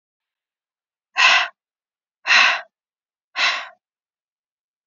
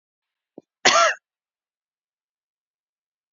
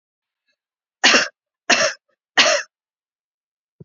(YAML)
exhalation_length: 4.9 s
exhalation_amplitude: 30936
exhalation_signal_mean_std_ratio: 0.32
cough_length: 3.3 s
cough_amplitude: 28357
cough_signal_mean_std_ratio: 0.23
three_cough_length: 3.8 s
three_cough_amplitude: 32329
three_cough_signal_mean_std_ratio: 0.33
survey_phase: beta (2021-08-13 to 2022-03-07)
age: 18-44
gender: Female
wearing_mask: 'No'
symptom_sore_throat: true
symptom_fatigue: true
symptom_headache: true
symptom_onset: 5 days
smoker_status: Never smoked
respiratory_condition_asthma: false
respiratory_condition_other: false
recruitment_source: REACT
submission_delay: 1 day
covid_test_result: Negative
covid_test_method: RT-qPCR